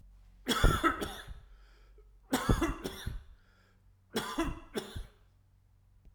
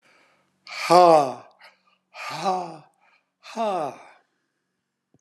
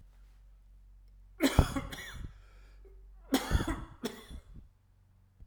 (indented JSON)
{
  "three_cough_length": "6.1 s",
  "three_cough_amplitude": 8802,
  "three_cough_signal_mean_std_ratio": 0.43,
  "exhalation_length": "5.2 s",
  "exhalation_amplitude": 28458,
  "exhalation_signal_mean_std_ratio": 0.32,
  "cough_length": "5.5 s",
  "cough_amplitude": 13538,
  "cough_signal_mean_std_ratio": 0.37,
  "survey_phase": "alpha (2021-03-01 to 2021-08-12)",
  "age": "65+",
  "gender": "Male",
  "wearing_mask": "No",
  "symptom_none": true,
  "smoker_status": "Never smoked",
  "respiratory_condition_asthma": false,
  "respiratory_condition_other": false,
  "recruitment_source": "Test and Trace",
  "submission_delay": "2 days",
  "covid_test_result": "Positive",
  "covid_test_method": "RT-qPCR"
}